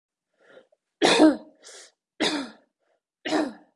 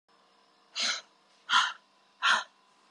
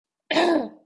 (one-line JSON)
{"three_cough_length": "3.8 s", "three_cough_amplitude": 24135, "three_cough_signal_mean_std_ratio": 0.35, "exhalation_length": "2.9 s", "exhalation_amplitude": 9049, "exhalation_signal_mean_std_ratio": 0.38, "cough_length": "0.9 s", "cough_amplitude": 15497, "cough_signal_mean_std_ratio": 0.57, "survey_phase": "beta (2021-08-13 to 2022-03-07)", "age": "18-44", "gender": "Female", "wearing_mask": "No", "symptom_cough_any": true, "symptom_runny_or_blocked_nose": true, "symptom_sore_throat": true, "smoker_status": "Current smoker (e-cigarettes or vapes only)", "respiratory_condition_asthma": false, "respiratory_condition_other": true, "recruitment_source": "REACT", "submission_delay": "1 day", "covid_test_result": "Negative", "covid_test_method": "RT-qPCR"}